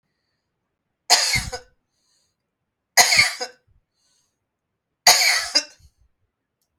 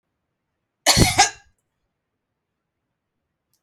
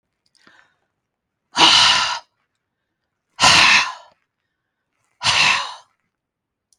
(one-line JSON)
{"three_cough_length": "6.8 s", "three_cough_amplitude": 32767, "three_cough_signal_mean_std_ratio": 0.32, "cough_length": "3.6 s", "cough_amplitude": 31916, "cough_signal_mean_std_ratio": 0.25, "exhalation_length": "6.8 s", "exhalation_amplitude": 32768, "exhalation_signal_mean_std_ratio": 0.38, "survey_phase": "beta (2021-08-13 to 2022-03-07)", "age": "65+", "gender": "Female", "wearing_mask": "No", "symptom_none": true, "smoker_status": "Never smoked", "respiratory_condition_asthma": false, "respiratory_condition_other": false, "recruitment_source": "REACT", "submission_delay": "1 day", "covid_test_result": "Negative", "covid_test_method": "RT-qPCR", "influenza_a_test_result": "Negative", "influenza_b_test_result": "Negative"}